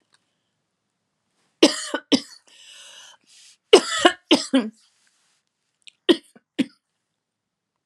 three_cough_length: 7.9 s
three_cough_amplitude: 32767
three_cough_signal_mean_std_ratio: 0.24
survey_phase: alpha (2021-03-01 to 2021-08-12)
age: 45-64
gender: Female
wearing_mask: 'No'
symptom_cough_any: true
symptom_abdominal_pain: true
symptom_fatigue: true
symptom_headache: true
symptom_change_to_sense_of_smell_or_taste: true
smoker_status: Never smoked
respiratory_condition_asthma: false
respiratory_condition_other: false
recruitment_source: Test and Trace
submission_delay: 2 days
covid_test_result: Positive
covid_test_method: RT-qPCR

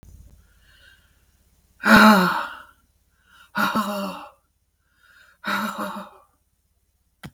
exhalation_length: 7.3 s
exhalation_amplitude: 32430
exhalation_signal_mean_std_ratio: 0.33
survey_phase: beta (2021-08-13 to 2022-03-07)
age: 65+
gender: Female
wearing_mask: 'No'
symptom_runny_or_blocked_nose: true
symptom_diarrhoea: true
smoker_status: Ex-smoker
respiratory_condition_asthma: false
respiratory_condition_other: false
recruitment_source: REACT
submission_delay: 3 days
covid_test_result: Negative
covid_test_method: RT-qPCR
influenza_a_test_result: Negative
influenza_b_test_result: Negative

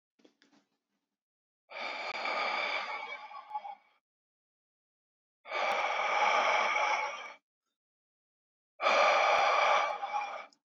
exhalation_length: 10.7 s
exhalation_amplitude: 6197
exhalation_signal_mean_std_ratio: 0.55
survey_phase: beta (2021-08-13 to 2022-03-07)
age: 18-44
gender: Male
wearing_mask: 'No'
symptom_cough_any: true
symptom_runny_or_blocked_nose: true
symptom_onset: 12 days
smoker_status: Never smoked
respiratory_condition_asthma: false
respiratory_condition_other: false
recruitment_source: REACT
submission_delay: 2 days
covid_test_result: Negative
covid_test_method: RT-qPCR
influenza_a_test_result: Negative
influenza_b_test_result: Negative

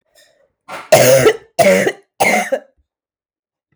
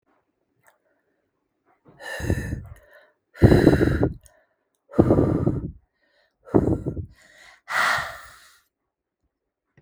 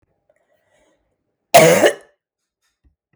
three_cough_length: 3.8 s
three_cough_amplitude: 32768
three_cough_signal_mean_std_ratio: 0.46
exhalation_length: 9.8 s
exhalation_amplitude: 32768
exhalation_signal_mean_std_ratio: 0.37
cough_length: 3.2 s
cough_amplitude: 32768
cough_signal_mean_std_ratio: 0.28
survey_phase: beta (2021-08-13 to 2022-03-07)
age: 18-44
gender: Female
wearing_mask: 'No'
symptom_cough_any: true
symptom_runny_or_blocked_nose: true
symptom_sore_throat: true
symptom_headache: true
symptom_onset: 3 days
smoker_status: Ex-smoker
respiratory_condition_asthma: false
respiratory_condition_other: false
recruitment_source: REACT
submission_delay: 1 day
covid_test_result: Negative
covid_test_method: RT-qPCR
influenza_a_test_result: Negative
influenza_b_test_result: Negative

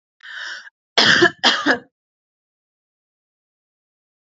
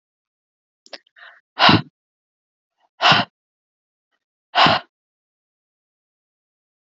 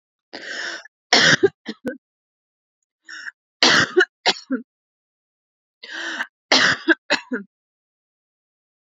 cough_length: 4.3 s
cough_amplitude: 32283
cough_signal_mean_std_ratio: 0.32
exhalation_length: 6.9 s
exhalation_amplitude: 32768
exhalation_signal_mean_std_ratio: 0.24
three_cough_length: 9.0 s
three_cough_amplitude: 32768
three_cough_signal_mean_std_ratio: 0.34
survey_phase: beta (2021-08-13 to 2022-03-07)
age: 18-44
gender: Female
wearing_mask: 'Yes'
symptom_cough_any: true
symptom_sore_throat: true
smoker_status: Never smoked
respiratory_condition_asthma: false
respiratory_condition_other: false
recruitment_source: REACT
submission_delay: 3 days
covid_test_result: Negative
covid_test_method: RT-qPCR
influenza_a_test_result: Negative
influenza_b_test_result: Negative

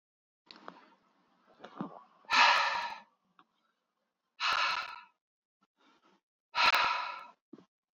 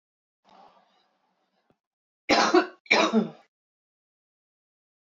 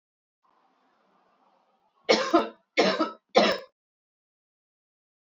exhalation_length: 7.9 s
exhalation_amplitude: 9532
exhalation_signal_mean_std_ratio: 0.36
cough_length: 5.0 s
cough_amplitude: 16740
cough_signal_mean_std_ratio: 0.3
three_cough_length: 5.2 s
three_cough_amplitude: 19365
three_cough_signal_mean_std_ratio: 0.31
survey_phase: beta (2021-08-13 to 2022-03-07)
age: 18-44
gender: Female
wearing_mask: 'No'
symptom_none: true
smoker_status: Ex-smoker
respiratory_condition_asthma: false
respiratory_condition_other: false
recruitment_source: REACT
submission_delay: 0 days
covid_test_result: Negative
covid_test_method: RT-qPCR
influenza_a_test_result: Negative
influenza_b_test_result: Negative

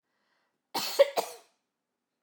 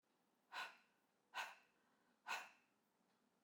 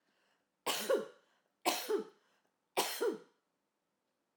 cough_length: 2.2 s
cough_amplitude: 11823
cough_signal_mean_std_ratio: 0.26
exhalation_length: 3.4 s
exhalation_amplitude: 633
exhalation_signal_mean_std_ratio: 0.35
three_cough_length: 4.4 s
three_cough_amplitude: 4173
three_cough_signal_mean_std_ratio: 0.4
survey_phase: alpha (2021-03-01 to 2021-08-12)
age: 45-64
gender: Female
wearing_mask: 'No'
symptom_none: true
smoker_status: Ex-smoker
respiratory_condition_asthma: false
respiratory_condition_other: false
recruitment_source: REACT
submission_delay: 2 days
covid_test_result: Negative
covid_test_method: RT-qPCR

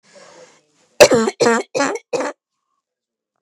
cough_length: 3.4 s
cough_amplitude: 32768
cough_signal_mean_std_ratio: 0.35
survey_phase: beta (2021-08-13 to 2022-03-07)
age: 18-44
gender: Female
wearing_mask: 'No'
symptom_none: true
symptom_onset: 3 days
smoker_status: Ex-smoker
respiratory_condition_asthma: false
respiratory_condition_other: false
recruitment_source: REACT
submission_delay: 4 days
covid_test_result: Negative
covid_test_method: RT-qPCR
influenza_a_test_result: Unknown/Void
influenza_b_test_result: Unknown/Void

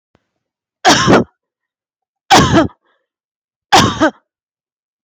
three_cough_length: 5.0 s
three_cough_amplitude: 32768
three_cough_signal_mean_std_ratio: 0.39
survey_phase: beta (2021-08-13 to 2022-03-07)
age: 18-44
gender: Female
wearing_mask: 'No'
symptom_none: true
smoker_status: Never smoked
respiratory_condition_asthma: false
respiratory_condition_other: false
recruitment_source: REACT
submission_delay: 1 day
covid_test_result: Negative
covid_test_method: RT-qPCR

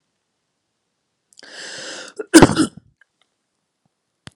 cough_length: 4.4 s
cough_amplitude: 32768
cough_signal_mean_std_ratio: 0.21
survey_phase: alpha (2021-03-01 to 2021-08-12)
age: 18-44
gender: Male
wearing_mask: 'No'
symptom_cough_any: true
symptom_fatigue: true
symptom_onset: 9 days
smoker_status: Never smoked
respiratory_condition_asthma: false
respiratory_condition_other: false
recruitment_source: Test and Trace
submission_delay: 2 days
covid_test_result: Positive
covid_test_method: RT-qPCR
covid_ct_value: 27.6
covid_ct_gene: N gene
covid_ct_mean: 28.0
covid_viral_load: 670 copies/ml
covid_viral_load_category: Minimal viral load (< 10K copies/ml)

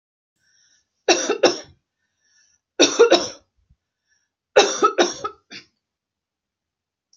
three_cough_length: 7.2 s
three_cough_amplitude: 32237
three_cough_signal_mean_std_ratio: 0.31
survey_phase: beta (2021-08-13 to 2022-03-07)
age: 45-64
gender: Female
wearing_mask: 'No'
symptom_none: true
smoker_status: Never smoked
respiratory_condition_asthma: false
respiratory_condition_other: false
recruitment_source: REACT
submission_delay: 2 days
covid_test_result: Negative
covid_test_method: RT-qPCR
influenza_a_test_result: Negative
influenza_b_test_result: Negative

